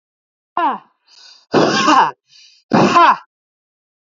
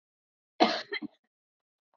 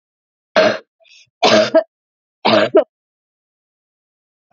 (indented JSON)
{
  "exhalation_length": "4.1 s",
  "exhalation_amplitude": 30666,
  "exhalation_signal_mean_std_ratio": 0.46,
  "cough_length": "2.0 s",
  "cough_amplitude": 11115,
  "cough_signal_mean_std_ratio": 0.26,
  "three_cough_length": "4.5 s",
  "three_cough_amplitude": 31438,
  "three_cough_signal_mean_std_ratio": 0.36,
  "survey_phase": "beta (2021-08-13 to 2022-03-07)",
  "age": "18-44",
  "gender": "Female",
  "wearing_mask": "No",
  "symptom_cough_any": true,
  "symptom_runny_or_blocked_nose": true,
  "symptom_fatigue": true,
  "smoker_status": "Ex-smoker",
  "respiratory_condition_asthma": false,
  "respiratory_condition_other": false,
  "recruitment_source": "Test and Trace",
  "submission_delay": "0 days",
  "covid_test_result": "Negative",
  "covid_test_method": "LFT"
}